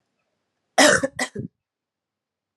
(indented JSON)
{
  "cough_length": "2.6 s",
  "cough_amplitude": 27398,
  "cough_signal_mean_std_ratio": 0.29,
  "survey_phase": "alpha (2021-03-01 to 2021-08-12)",
  "age": "18-44",
  "gender": "Female",
  "wearing_mask": "No",
  "symptom_cough_any": true,
  "symptom_new_continuous_cough": true,
  "symptom_fatigue": true,
  "symptom_fever_high_temperature": true,
  "symptom_headache": true,
  "symptom_onset": "3 days",
  "smoker_status": "Never smoked",
  "respiratory_condition_asthma": false,
  "respiratory_condition_other": false,
  "recruitment_source": "Test and Trace",
  "submission_delay": "2 days",
  "covid_test_method": "RT-qPCR"
}